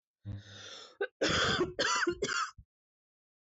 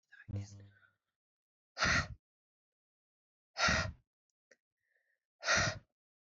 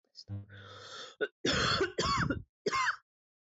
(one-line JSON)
{"cough_length": "3.6 s", "cough_amplitude": 3724, "cough_signal_mean_std_ratio": 0.55, "exhalation_length": "6.4 s", "exhalation_amplitude": 4443, "exhalation_signal_mean_std_ratio": 0.33, "three_cough_length": "3.4 s", "three_cough_amplitude": 4131, "three_cough_signal_mean_std_ratio": 0.6, "survey_phase": "beta (2021-08-13 to 2022-03-07)", "age": "18-44", "gender": "Female", "wearing_mask": "No", "symptom_cough_any": true, "symptom_shortness_of_breath": true, "symptom_sore_throat": true, "symptom_headache": true, "symptom_onset": "8 days", "smoker_status": "Never smoked", "respiratory_condition_asthma": true, "respiratory_condition_other": false, "recruitment_source": "REACT", "submission_delay": "3 days", "covid_test_result": "Negative", "covid_test_method": "RT-qPCR"}